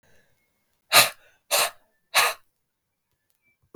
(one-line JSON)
{"exhalation_length": "3.8 s", "exhalation_amplitude": 32766, "exhalation_signal_mean_std_ratio": 0.28, "survey_phase": "beta (2021-08-13 to 2022-03-07)", "age": "18-44", "gender": "Male", "wearing_mask": "No", "symptom_cough_any": true, "symptom_shortness_of_breath": true, "symptom_fatigue": true, "symptom_change_to_sense_of_smell_or_taste": true, "symptom_onset": "3 days", "smoker_status": "Ex-smoker", "respiratory_condition_asthma": false, "respiratory_condition_other": false, "recruitment_source": "Test and Trace", "submission_delay": "2 days", "covid_test_result": "Positive", "covid_test_method": "RT-qPCR", "covid_ct_value": 20.3, "covid_ct_gene": "ORF1ab gene"}